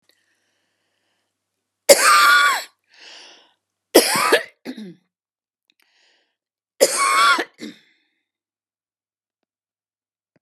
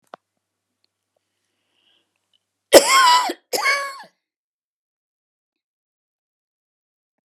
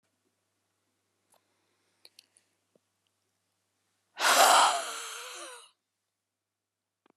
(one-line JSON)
{"three_cough_length": "10.4 s", "three_cough_amplitude": 32768, "three_cough_signal_mean_std_ratio": 0.32, "cough_length": "7.3 s", "cough_amplitude": 32768, "cough_signal_mean_std_ratio": 0.25, "exhalation_length": "7.2 s", "exhalation_amplitude": 13478, "exhalation_signal_mean_std_ratio": 0.26, "survey_phase": "beta (2021-08-13 to 2022-03-07)", "age": "65+", "gender": "Female", "wearing_mask": "No", "symptom_none": true, "smoker_status": "Never smoked", "respiratory_condition_asthma": true, "respiratory_condition_other": false, "recruitment_source": "REACT", "submission_delay": "1 day", "covid_test_result": "Negative", "covid_test_method": "RT-qPCR"}